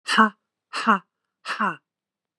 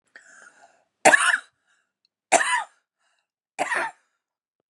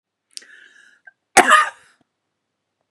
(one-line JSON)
{"exhalation_length": "2.4 s", "exhalation_amplitude": 28070, "exhalation_signal_mean_std_ratio": 0.36, "three_cough_length": "4.7 s", "three_cough_amplitude": 31402, "three_cough_signal_mean_std_ratio": 0.31, "cough_length": "2.9 s", "cough_amplitude": 32768, "cough_signal_mean_std_ratio": 0.25, "survey_phase": "beta (2021-08-13 to 2022-03-07)", "age": "45-64", "gender": "Female", "wearing_mask": "No", "symptom_diarrhoea": true, "symptom_fatigue": true, "smoker_status": "Ex-smoker", "respiratory_condition_asthma": false, "respiratory_condition_other": true, "recruitment_source": "Test and Trace", "submission_delay": "1 day", "covid_test_result": "Negative", "covid_test_method": "ePCR"}